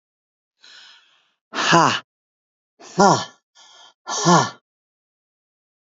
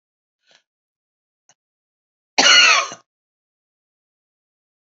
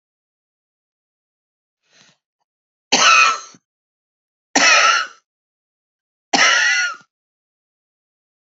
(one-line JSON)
{"exhalation_length": "6.0 s", "exhalation_amplitude": 29703, "exhalation_signal_mean_std_ratio": 0.31, "cough_length": "4.9 s", "cough_amplitude": 30529, "cough_signal_mean_std_ratio": 0.25, "three_cough_length": "8.5 s", "three_cough_amplitude": 30611, "three_cough_signal_mean_std_ratio": 0.35, "survey_phase": "alpha (2021-03-01 to 2021-08-12)", "age": "45-64", "gender": "Female", "wearing_mask": "No", "symptom_shortness_of_breath": true, "symptom_abdominal_pain": true, "symptom_diarrhoea": true, "symptom_fatigue": true, "symptom_onset": "5 days", "smoker_status": "Ex-smoker", "respiratory_condition_asthma": false, "respiratory_condition_other": false, "recruitment_source": "REACT", "submission_delay": "2 days", "covid_test_result": "Negative", "covid_test_method": "RT-qPCR"}